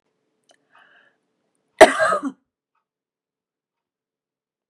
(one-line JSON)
{"cough_length": "4.7 s", "cough_amplitude": 32768, "cough_signal_mean_std_ratio": 0.18, "survey_phase": "beta (2021-08-13 to 2022-03-07)", "age": "45-64", "gender": "Female", "wearing_mask": "No", "symptom_fatigue": true, "smoker_status": "Never smoked", "respiratory_condition_asthma": false, "respiratory_condition_other": false, "recruitment_source": "REACT", "submission_delay": "5 days", "covid_test_result": "Negative", "covid_test_method": "RT-qPCR", "influenza_a_test_result": "Unknown/Void", "influenza_b_test_result": "Unknown/Void"}